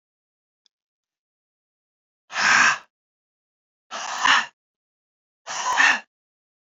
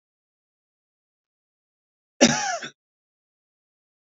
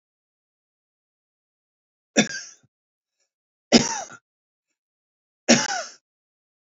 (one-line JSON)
{"exhalation_length": "6.7 s", "exhalation_amplitude": 23647, "exhalation_signal_mean_std_ratio": 0.33, "cough_length": "4.0 s", "cough_amplitude": 29376, "cough_signal_mean_std_ratio": 0.2, "three_cough_length": "6.7 s", "three_cough_amplitude": 29275, "three_cough_signal_mean_std_ratio": 0.22, "survey_phase": "beta (2021-08-13 to 2022-03-07)", "age": "45-64", "gender": "Male", "wearing_mask": "No", "symptom_none": true, "smoker_status": "Ex-smoker", "respiratory_condition_asthma": false, "respiratory_condition_other": false, "recruitment_source": "REACT", "submission_delay": "1 day", "covid_test_result": "Negative", "covid_test_method": "RT-qPCR"}